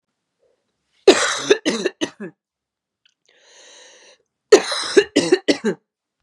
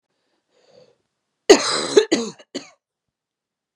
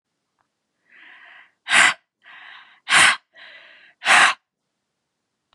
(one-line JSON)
{"cough_length": "6.2 s", "cough_amplitude": 32768, "cough_signal_mean_std_ratio": 0.32, "three_cough_length": "3.8 s", "three_cough_amplitude": 32768, "three_cough_signal_mean_std_ratio": 0.26, "exhalation_length": "5.5 s", "exhalation_amplitude": 27762, "exhalation_signal_mean_std_ratio": 0.31, "survey_phase": "beta (2021-08-13 to 2022-03-07)", "age": "18-44", "gender": "Female", "wearing_mask": "No", "symptom_cough_any": true, "symptom_runny_or_blocked_nose": true, "symptom_shortness_of_breath": true, "symptom_fatigue": true, "symptom_headache": true, "symptom_change_to_sense_of_smell_or_taste": true, "symptom_loss_of_taste": true, "symptom_onset": "3 days", "smoker_status": "Ex-smoker", "respiratory_condition_asthma": false, "respiratory_condition_other": false, "recruitment_source": "Test and Trace", "submission_delay": "1 day", "covid_test_result": "Positive", "covid_test_method": "RT-qPCR", "covid_ct_value": 20.9, "covid_ct_gene": "ORF1ab gene"}